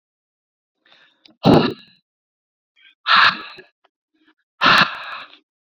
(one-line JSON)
{"exhalation_length": "5.6 s", "exhalation_amplitude": 29208, "exhalation_signal_mean_std_ratio": 0.32, "survey_phase": "beta (2021-08-13 to 2022-03-07)", "age": "18-44", "gender": "Male", "wearing_mask": "No", "symptom_none": true, "smoker_status": "Never smoked", "respiratory_condition_asthma": false, "respiratory_condition_other": false, "recruitment_source": "REACT", "submission_delay": "1 day", "covid_test_result": "Negative", "covid_test_method": "RT-qPCR", "influenza_a_test_result": "Negative", "influenza_b_test_result": "Negative"}